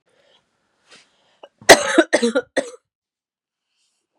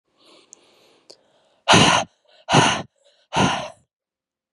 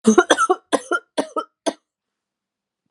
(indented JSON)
{
  "cough_length": "4.2 s",
  "cough_amplitude": 32768,
  "cough_signal_mean_std_ratio": 0.25,
  "exhalation_length": "4.5 s",
  "exhalation_amplitude": 30565,
  "exhalation_signal_mean_std_ratio": 0.36,
  "three_cough_length": "2.9 s",
  "three_cough_amplitude": 32764,
  "three_cough_signal_mean_std_ratio": 0.35,
  "survey_phase": "beta (2021-08-13 to 2022-03-07)",
  "age": "18-44",
  "gender": "Female",
  "wearing_mask": "No",
  "symptom_cough_any": true,
  "symptom_runny_or_blocked_nose": true,
  "symptom_sore_throat": true,
  "smoker_status": "Ex-smoker",
  "respiratory_condition_asthma": false,
  "respiratory_condition_other": false,
  "recruitment_source": "Test and Trace",
  "submission_delay": "2 days",
  "covid_test_result": "Positive",
  "covid_test_method": "ePCR"
}